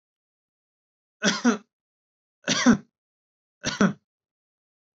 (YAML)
three_cough_length: 4.9 s
three_cough_amplitude: 17740
three_cough_signal_mean_std_ratio: 0.29
survey_phase: alpha (2021-03-01 to 2021-08-12)
age: 18-44
gender: Male
wearing_mask: 'No'
symptom_none: true
smoker_status: Never smoked
respiratory_condition_asthma: false
respiratory_condition_other: false
recruitment_source: Test and Trace
submission_delay: 2 days
covid_test_result: Positive
covid_test_method: RT-qPCR
covid_ct_value: 30.6
covid_ct_gene: ORF1ab gene
covid_ct_mean: 30.9
covid_viral_load: 74 copies/ml
covid_viral_load_category: Minimal viral load (< 10K copies/ml)